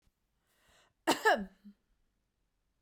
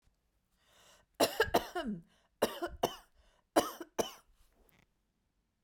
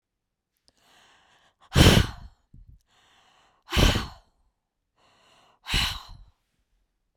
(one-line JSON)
{"cough_length": "2.8 s", "cough_amplitude": 7758, "cough_signal_mean_std_ratio": 0.25, "three_cough_length": "5.6 s", "three_cough_amplitude": 8048, "three_cough_signal_mean_std_ratio": 0.31, "exhalation_length": "7.2 s", "exhalation_amplitude": 25295, "exhalation_signal_mean_std_ratio": 0.27, "survey_phase": "beta (2021-08-13 to 2022-03-07)", "age": "45-64", "gender": "Female", "wearing_mask": "No", "symptom_none": true, "smoker_status": "Never smoked", "respiratory_condition_asthma": false, "respiratory_condition_other": false, "recruitment_source": "REACT", "submission_delay": "2 days", "covid_test_result": "Negative", "covid_test_method": "RT-qPCR", "influenza_a_test_result": "Negative", "influenza_b_test_result": "Negative"}